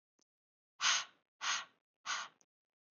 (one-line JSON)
{"exhalation_length": "2.9 s", "exhalation_amplitude": 3976, "exhalation_signal_mean_std_ratio": 0.35, "survey_phase": "beta (2021-08-13 to 2022-03-07)", "age": "18-44", "gender": "Female", "wearing_mask": "No", "symptom_cough_any": true, "symptom_runny_or_blocked_nose": true, "symptom_sore_throat": true, "symptom_onset": "3 days", "smoker_status": "Never smoked", "respiratory_condition_asthma": false, "respiratory_condition_other": false, "recruitment_source": "Test and Trace", "submission_delay": "1 day", "covid_test_result": "Positive", "covid_test_method": "RT-qPCR", "covid_ct_value": 21.2, "covid_ct_gene": "ORF1ab gene", "covid_ct_mean": 21.4, "covid_viral_load": "92000 copies/ml", "covid_viral_load_category": "Low viral load (10K-1M copies/ml)"}